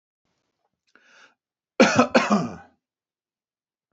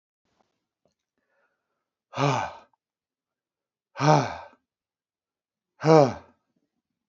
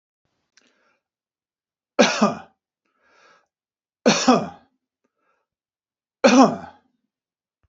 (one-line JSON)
{"cough_length": "3.9 s", "cough_amplitude": 30056, "cough_signal_mean_std_ratio": 0.29, "exhalation_length": "7.1 s", "exhalation_amplitude": 23465, "exhalation_signal_mean_std_ratio": 0.24, "three_cough_length": "7.7 s", "three_cough_amplitude": 27345, "three_cough_signal_mean_std_ratio": 0.27, "survey_phase": "beta (2021-08-13 to 2022-03-07)", "age": "45-64", "gender": "Male", "wearing_mask": "No", "symptom_none": true, "smoker_status": "Never smoked", "respiratory_condition_asthma": false, "respiratory_condition_other": false, "recruitment_source": "REACT", "submission_delay": "4 days", "covid_test_result": "Negative", "covid_test_method": "RT-qPCR", "influenza_a_test_result": "Negative", "influenza_b_test_result": "Negative"}